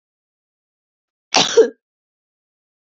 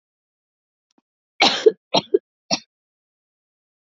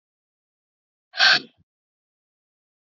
{"cough_length": "3.0 s", "cough_amplitude": 29555, "cough_signal_mean_std_ratio": 0.23, "three_cough_length": "3.8 s", "three_cough_amplitude": 27482, "three_cough_signal_mean_std_ratio": 0.23, "exhalation_length": "3.0 s", "exhalation_amplitude": 22762, "exhalation_signal_mean_std_ratio": 0.21, "survey_phase": "beta (2021-08-13 to 2022-03-07)", "age": "18-44", "gender": "Female", "wearing_mask": "No", "symptom_cough_any": true, "symptom_new_continuous_cough": true, "symptom_runny_or_blocked_nose": true, "symptom_fatigue": true, "symptom_fever_high_temperature": true, "symptom_headache": true, "symptom_onset": "3 days", "smoker_status": "Never smoked", "respiratory_condition_asthma": false, "respiratory_condition_other": false, "recruitment_source": "Test and Trace", "submission_delay": "1 day", "covid_test_result": "Positive", "covid_test_method": "RT-qPCR", "covid_ct_value": 16.8, "covid_ct_gene": "ORF1ab gene"}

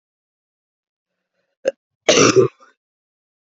{"cough_length": "3.6 s", "cough_amplitude": 31153, "cough_signal_mean_std_ratio": 0.27, "survey_phase": "beta (2021-08-13 to 2022-03-07)", "age": "18-44", "gender": "Female", "wearing_mask": "No", "symptom_cough_any": true, "symptom_new_continuous_cough": true, "symptom_runny_or_blocked_nose": true, "symptom_sore_throat": true, "symptom_fatigue": true, "symptom_fever_high_temperature": true, "symptom_headache": true, "symptom_change_to_sense_of_smell_or_taste": true, "symptom_loss_of_taste": true, "symptom_onset": "6 days", "smoker_status": "Never smoked", "respiratory_condition_asthma": false, "respiratory_condition_other": false, "recruitment_source": "Test and Trace", "submission_delay": "2 days", "covid_test_result": "Positive", "covid_test_method": "RT-qPCR", "covid_ct_value": 24.8, "covid_ct_gene": "ORF1ab gene"}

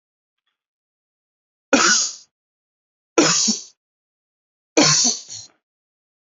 {"three_cough_length": "6.4 s", "three_cough_amplitude": 28251, "three_cough_signal_mean_std_ratio": 0.35, "survey_phase": "beta (2021-08-13 to 2022-03-07)", "age": "18-44", "gender": "Male", "wearing_mask": "No", "symptom_sore_throat": true, "symptom_headache": true, "symptom_onset": "4 days", "smoker_status": "Current smoker (e-cigarettes or vapes only)", "respiratory_condition_asthma": false, "respiratory_condition_other": false, "recruitment_source": "Test and Trace", "submission_delay": "2 days", "covid_test_result": "Positive", "covid_test_method": "RT-qPCR", "covid_ct_value": 28.3, "covid_ct_gene": "ORF1ab gene", "covid_ct_mean": 28.6, "covid_viral_load": "430 copies/ml", "covid_viral_load_category": "Minimal viral load (< 10K copies/ml)"}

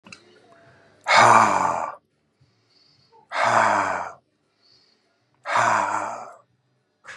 {"exhalation_length": "7.2 s", "exhalation_amplitude": 28223, "exhalation_signal_mean_std_ratio": 0.43, "survey_phase": "beta (2021-08-13 to 2022-03-07)", "age": "65+", "gender": "Male", "wearing_mask": "No", "symptom_none": true, "smoker_status": "Never smoked", "respiratory_condition_asthma": false, "respiratory_condition_other": false, "recruitment_source": "REACT", "submission_delay": "3 days", "covid_test_result": "Negative", "covid_test_method": "RT-qPCR", "influenza_a_test_result": "Negative", "influenza_b_test_result": "Negative"}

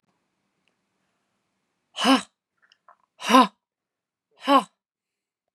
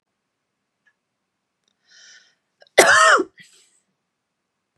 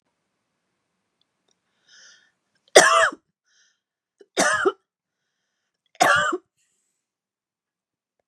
{"exhalation_length": "5.5 s", "exhalation_amplitude": 28036, "exhalation_signal_mean_std_ratio": 0.24, "cough_length": "4.8 s", "cough_amplitude": 32768, "cough_signal_mean_std_ratio": 0.25, "three_cough_length": "8.3 s", "three_cough_amplitude": 32768, "three_cough_signal_mean_std_ratio": 0.26, "survey_phase": "beta (2021-08-13 to 2022-03-07)", "age": "45-64", "gender": "Female", "wearing_mask": "No", "symptom_none": true, "smoker_status": "Ex-smoker", "respiratory_condition_asthma": false, "respiratory_condition_other": false, "recruitment_source": "REACT", "submission_delay": "0 days", "covid_test_result": "Negative", "covid_test_method": "RT-qPCR", "influenza_a_test_result": "Unknown/Void", "influenza_b_test_result": "Unknown/Void"}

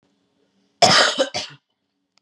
{"cough_length": "2.2 s", "cough_amplitude": 32322, "cough_signal_mean_std_ratio": 0.37, "survey_phase": "beta (2021-08-13 to 2022-03-07)", "age": "18-44", "gender": "Female", "wearing_mask": "No", "symptom_cough_any": true, "symptom_runny_or_blocked_nose": true, "symptom_sore_throat": true, "symptom_fatigue": true, "symptom_headache": true, "smoker_status": "Never smoked", "respiratory_condition_asthma": false, "respiratory_condition_other": false, "recruitment_source": "Test and Trace", "submission_delay": "2 days", "covid_test_result": "Positive", "covid_test_method": "LFT"}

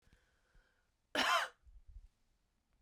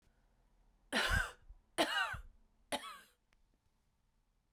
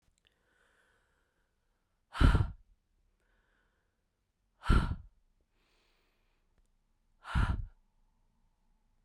{"cough_length": "2.8 s", "cough_amplitude": 3051, "cough_signal_mean_std_ratio": 0.3, "three_cough_length": "4.5 s", "three_cough_amplitude": 3273, "three_cough_signal_mean_std_ratio": 0.37, "exhalation_length": "9.0 s", "exhalation_amplitude": 8596, "exhalation_signal_mean_std_ratio": 0.24, "survey_phase": "beta (2021-08-13 to 2022-03-07)", "age": "45-64", "gender": "Female", "wearing_mask": "No", "symptom_cough_any": true, "symptom_runny_or_blocked_nose": true, "symptom_sore_throat": true, "symptom_fatigue": true, "symptom_fever_high_temperature": true, "symptom_headache": true, "symptom_other": true, "symptom_onset": "3 days", "smoker_status": "Ex-smoker", "respiratory_condition_asthma": true, "respiratory_condition_other": false, "recruitment_source": "Test and Trace", "submission_delay": "1 day", "covid_test_result": "Positive", "covid_test_method": "ePCR"}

